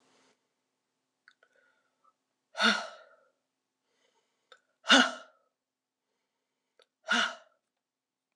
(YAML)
exhalation_length: 8.4 s
exhalation_amplitude: 16430
exhalation_signal_mean_std_ratio: 0.21
survey_phase: beta (2021-08-13 to 2022-03-07)
age: 45-64
gender: Female
wearing_mask: 'No'
symptom_cough_any: true
symptom_runny_or_blocked_nose: true
symptom_fatigue: true
symptom_onset: 8 days
smoker_status: Ex-smoker
respiratory_condition_asthma: false
respiratory_condition_other: false
recruitment_source: Test and Trace
submission_delay: 2 days
covid_test_result: Positive
covid_test_method: RT-qPCR